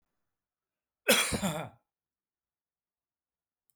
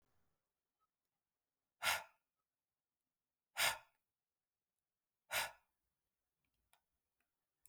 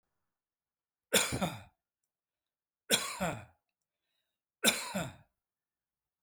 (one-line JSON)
{"cough_length": "3.8 s", "cough_amplitude": 11089, "cough_signal_mean_std_ratio": 0.27, "exhalation_length": "7.7 s", "exhalation_amplitude": 2406, "exhalation_signal_mean_std_ratio": 0.21, "three_cough_length": "6.2 s", "three_cough_amplitude": 9376, "three_cough_signal_mean_std_ratio": 0.31, "survey_phase": "beta (2021-08-13 to 2022-03-07)", "age": "45-64", "gender": "Male", "wearing_mask": "No", "symptom_none": true, "smoker_status": "Never smoked", "respiratory_condition_asthma": false, "respiratory_condition_other": false, "recruitment_source": "REACT", "submission_delay": "1 day", "covid_test_result": "Negative", "covid_test_method": "RT-qPCR"}